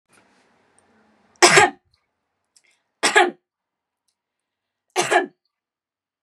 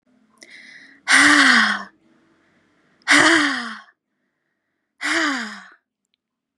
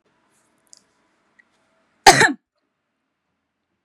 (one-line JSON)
{"three_cough_length": "6.2 s", "three_cough_amplitude": 32767, "three_cough_signal_mean_std_ratio": 0.26, "exhalation_length": "6.6 s", "exhalation_amplitude": 29915, "exhalation_signal_mean_std_ratio": 0.41, "cough_length": "3.8 s", "cough_amplitude": 32768, "cough_signal_mean_std_ratio": 0.18, "survey_phase": "beta (2021-08-13 to 2022-03-07)", "age": "18-44", "gender": "Female", "wearing_mask": "No", "symptom_none": true, "smoker_status": "Never smoked", "respiratory_condition_asthma": false, "respiratory_condition_other": false, "recruitment_source": "REACT", "submission_delay": "1 day", "covid_test_result": "Negative", "covid_test_method": "RT-qPCR"}